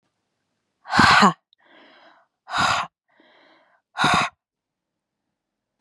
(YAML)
exhalation_length: 5.8 s
exhalation_amplitude: 29966
exhalation_signal_mean_std_ratio: 0.33
survey_phase: beta (2021-08-13 to 2022-03-07)
age: 18-44
gender: Female
wearing_mask: 'No'
symptom_fatigue: true
symptom_onset: 13 days
smoker_status: Never smoked
respiratory_condition_asthma: false
respiratory_condition_other: false
recruitment_source: REACT
submission_delay: 1 day
covid_test_result: Negative
covid_test_method: RT-qPCR
influenza_a_test_result: Negative
influenza_b_test_result: Negative